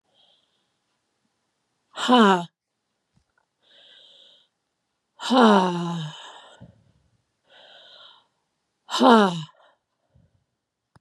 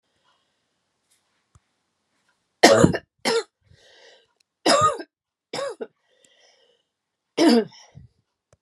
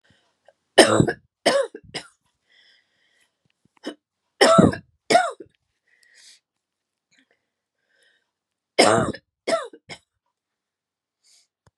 {"exhalation_length": "11.0 s", "exhalation_amplitude": 29190, "exhalation_signal_mean_std_ratio": 0.3, "cough_length": "8.6 s", "cough_amplitude": 32722, "cough_signal_mean_std_ratio": 0.29, "three_cough_length": "11.8 s", "three_cough_amplitude": 32768, "three_cough_signal_mean_std_ratio": 0.27, "survey_phase": "beta (2021-08-13 to 2022-03-07)", "age": "65+", "gender": "Female", "wearing_mask": "No", "symptom_cough_any": true, "symptom_runny_or_blocked_nose": true, "symptom_shortness_of_breath": true, "symptom_onset": "7 days", "smoker_status": "Never smoked", "respiratory_condition_asthma": false, "respiratory_condition_other": true, "recruitment_source": "REACT", "submission_delay": "3 days", "covid_test_result": "Negative", "covid_test_method": "RT-qPCR"}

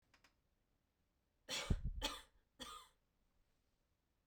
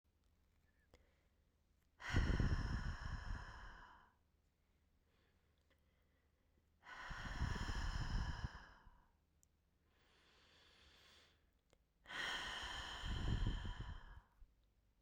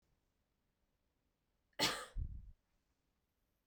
{"three_cough_length": "4.3 s", "three_cough_amplitude": 2152, "three_cough_signal_mean_std_ratio": 0.32, "exhalation_length": "15.0 s", "exhalation_amplitude": 1718, "exhalation_signal_mean_std_ratio": 0.48, "cough_length": "3.7 s", "cough_amplitude": 2466, "cough_signal_mean_std_ratio": 0.28, "survey_phase": "beta (2021-08-13 to 2022-03-07)", "age": "18-44", "gender": "Female", "wearing_mask": "No", "symptom_none": true, "symptom_onset": "2 days", "smoker_status": "Never smoked", "respiratory_condition_asthma": false, "respiratory_condition_other": false, "recruitment_source": "Test and Trace", "submission_delay": "1 day", "covid_test_result": "Negative", "covid_test_method": "RT-qPCR"}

